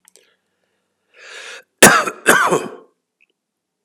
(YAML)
cough_length: 3.8 s
cough_amplitude: 32768
cough_signal_mean_std_ratio: 0.31
survey_phase: alpha (2021-03-01 to 2021-08-12)
age: 65+
gender: Male
wearing_mask: 'No'
symptom_cough_any: true
symptom_fatigue: true
symptom_change_to_sense_of_smell_or_taste: true
symptom_loss_of_taste: true
symptom_onset: 9 days
smoker_status: Ex-smoker
respiratory_condition_asthma: false
respiratory_condition_other: false
recruitment_source: Test and Trace
submission_delay: 2 days
covid_test_result: Positive
covid_test_method: RT-qPCR
covid_ct_value: 22.1
covid_ct_gene: N gene
covid_ct_mean: 22.4
covid_viral_load: 46000 copies/ml
covid_viral_load_category: Low viral load (10K-1M copies/ml)